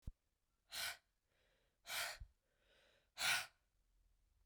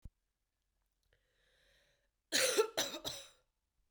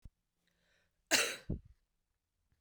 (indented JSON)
{
  "exhalation_length": "4.5 s",
  "exhalation_amplitude": 1606,
  "exhalation_signal_mean_std_ratio": 0.34,
  "three_cough_length": "3.9 s",
  "three_cough_amplitude": 3736,
  "three_cough_signal_mean_std_ratio": 0.31,
  "cough_length": "2.6 s",
  "cough_amplitude": 6631,
  "cough_signal_mean_std_ratio": 0.27,
  "survey_phase": "beta (2021-08-13 to 2022-03-07)",
  "age": "18-44",
  "gender": "Female",
  "wearing_mask": "No",
  "symptom_cough_any": true,
  "symptom_runny_or_blocked_nose": true,
  "symptom_sore_throat": true,
  "symptom_fatigue": true,
  "symptom_onset": "2 days",
  "smoker_status": "Never smoked",
  "respiratory_condition_asthma": false,
  "respiratory_condition_other": false,
  "recruitment_source": "Test and Trace",
  "submission_delay": "2 days",
  "covid_test_result": "Positive",
  "covid_test_method": "RT-qPCR",
  "covid_ct_value": 27.7,
  "covid_ct_gene": "ORF1ab gene"
}